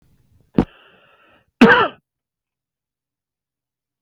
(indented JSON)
{
  "cough_length": "4.0 s",
  "cough_amplitude": 32767,
  "cough_signal_mean_std_ratio": 0.22,
  "survey_phase": "beta (2021-08-13 to 2022-03-07)",
  "age": "45-64",
  "gender": "Male",
  "wearing_mask": "No",
  "symptom_none": true,
  "smoker_status": "Ex-smoker",
  "respiratory_condition_asthma": false,
  "respiratory_condition_other": false,
  "recruitment_source": "REACT",
  "submission_delay": "3 days",
  "covid_test_result": "Negative",
  "covid_test_method": "RT-qPCR",
  "influenza_a_test_result": "Negative",
  "influenza_b_test_result": "Negative"
}